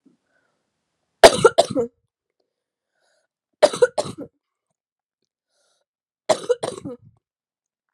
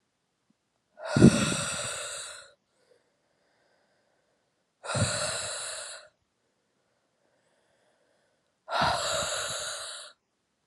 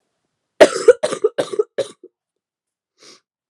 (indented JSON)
{
  "three_cough_length": "7.9 s",
  "three_cough_amplitude": 32768,
  "three_cough_signal_mean_std_ratio": 0.21,
  "exhalation_length": "10.7 s",
  "exhalation_amplitude": 21755,
  "exhalation_signal_mean_std_ratio": 0.35,
  "cough_length": "3.5 s",
  "cough_amplitude": 32768,
  "cough_signal_mean_std_ratio": 0.26,
  "survey_phase": "beta (2021-08-13 to 2022-03-07)",
  "age": "18-44",
  "gender": "Female",
  "wearing_mask": "No",
  "symptom_cough_any": true,
  "symptom_new_continuous_cough": true,
  "symptom_runny_or_blocked_nose": true,
  "symptom_shortness_of_breath": true,
  "symptom_fatigue": true,
  "symptom_headache": true,
  "symptom_onset": "4 days",
  "smoker_status": "Never smoked",
  "respiratory_condition_asthma": true,
  "respiratory_condition_other": false,
  "recruitment_source": "Test and Trace",
  "submission_delay": "2 days",
  "covid_test_result": "Positive",
  "covid_test_method": "ePCR"
}